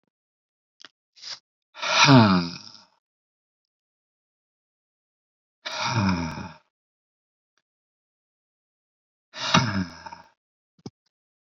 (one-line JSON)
{"exhalation_length": "11.4 s", "exhalation_amplitude": 24404, "exhalation_signal_mean_std_ratio": 0.28, "survey_phase": "beta (2021-08-13 to 2022-03-07)", "age": "18-44", "gender": "Male", "wearing_mask": "No", "symptom_runny_or_blocked_nose": true, "smoker_status": "Never smoked", "respiratory_condition_asthma": false, "respiratory_condition_other": false, "recruitment_source": "Test and Trace", "submission_delay": "2 days", "covid_test_result": "Positive", "covid_test_method": "RT-qPCR", "covid_ct_value": 23.5, "covid_ct_gene": "ORF1ab gene"}